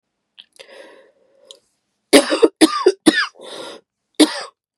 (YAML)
cough_length: 4.8 s
cough_amplitude: 32768
cough_signal_mean_std_ratio: 0.32
survey_phase: beta (2021-08-13 to 2022-03-07)
age: 45-64
gender: Female
wearing_mask: 'No'
symptom_cough_any: true
symptom_new_continuous_cough: true
symptom_runny_or_blocked_nose: true
symptom_sore_throat: true
symptom_fatigue: true
symptom_fever_high_temperature: true
symptom_headache: true
symptom_onset: 3 days
smoker_status: Never smoked
respiratory_condition_asthma: false
respiratory_condition_other: false
recruitment_source: Test and Trace
submission_delay: 2 days
covid_test_result: Positive
covid_test_method: RT-qPCR
covid_ct_value: 24.5
covid_ct_gene: ORF1ab gene
covid_ct_mean: 24.6
covid_viral_load: 8600 copies/ml
covid_viral_load_category: Minimal viral load (< 10K copies/ml)